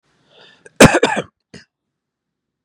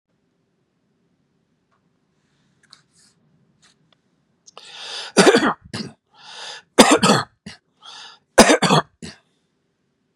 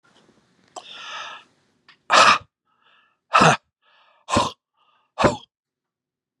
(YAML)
cough_length: 2.6 s
cough_amplitude: 32768
cough_signal_mean_std_ratio: 0.25
three_cough_length: 10.2 s
three_cough_amplitude: 32768
three_cough_signal_mean_std_ratio: 0.27
exhalation_length: 6.4 s
exhalation_amplitude: 29875
exhalation_signal_mean_std_ratio: 0.3
survey_phase: beta (2021-08-13 to 2022-03-07)
age: 65+
gender: Male
wearing_mask: 'No'
symptom_none: true
smoker_status: Ex-smoker
respiratory_condition_asthma: false
respiratory_condition_other: false
recruitment_source: REACT
submission_delay: 2 days
covid_test_result: Negative
covid_test_method: RT-qPCR